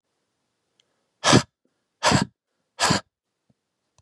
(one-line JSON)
{"exhalation_length": "4.0 s", "exhalation_amplitude": 28357, "exhalation_signal_mean_std_ratio": 0.28, "survey_phase": "beta (2021-08-13 to 2022-03-07)", "age": "45-64", "gender": "Male", "wearing_mask": "No", "symptom_none": true, "smoker_status": "Never smoked", "respiratory_condition_asthma": false, "respiratory_condition_other": false, "recruitment_source": "Test and Trace", "submission_delay": "1 day", "covid_test_result": "Negative", "covid_test_method": "ePCR"}